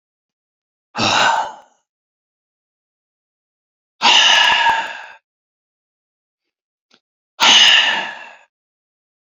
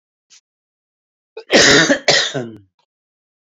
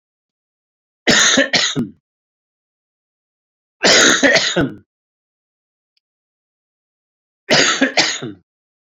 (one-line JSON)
{"exhalation_length": "9.4 s", "exhalation_amplitude": 31734, "exhalation_signal_mean_std_ratio": 0.38, "cough_length": "3.4 s", "cough_amplitude": 32401, "cough_signal_mean_std_ratio": 0.39, "three_cough_length": "9.0 s", "three_cough_amplitude": 32768, "three_cough_signal_mean_std_ratio": 0.39, "survey_phase": "beta (2021-08-13 to 2022-03-07)", "age": "65+", "gender": "Male", "wearing_mask": "No", "symptom_none": true, "smoker_status": "Ex-smoker", "respiratory_condition_asthma": false, "respiratory_condition_other": true, "recruitment_source": "REACT", "submission_delay": "1 day", "covid_test_result": "Negative", "covid_test_method": "RT-qPCR"}